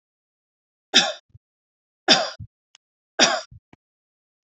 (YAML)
three_cough_length: 4.4 s
three_cough_amplitude: 30852
three_cough_signal_mean_std_ratio: 0.26
survey_phase: beta (2021-08-13 to 2022-03-07)
age: 45-64
gender: Female
wearing_mask: 'No'
symptom_none: true
smoker_status: Never smoked
respiratory_condition_asthma: false
respiratory_condition_other: false
recruitment_source: REACT
submission_delay: 3 days
covid_test_result: Negative
covid_test_method: RT-qPCR
influenza_a_test_result: Negative
influenza_b_test_result: Negative